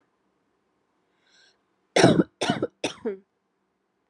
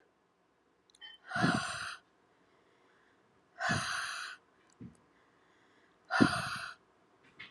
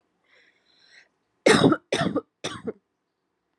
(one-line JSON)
{"cough_length": "4.1 s", "cough_amplitude": 21303, "cough_signal_mean_std_ratio": 0.28, "exhalation_length": "7.5 s", "exhalation_amplitude": 9112, "exhalation_signal_mean_std_ratio": 0.37, "three_cough_length": "3.6 s", "three_cough_amplitude": 20571, "three_cough_signal_mean_std_ratio": 0.32, "survey_phase": "alpha (2021-03-01 to 2021-08-12)", "age": "18-44", "gender": "Female", "wearing_mask": "No", "symptom_cough_any": true, "symptom_fatigue": true, "symptom_change_to_sense_of_smell_or_taste": true, "symptom_loss_of_taste": true, "smoker_status": "Current smoker (1 to 10 cigarettes per day)", "respiratory_condition_asthma": false, "respiratory_condition_other": false, "recruitment_source": "Test and Trace", "submission_delay": "2 days", "covid_test_result": "Positive", "covid_test_method": "RT-qPCR", "covid_ct_value": 16.5, "covid_ct_gene": "ORF1ab gene", "covid_ct_mean": 17.5, "covid_viral_load": "1800000 copies/ml", "covid_viral_load_category": "High viral load (>1M copies/ml)"}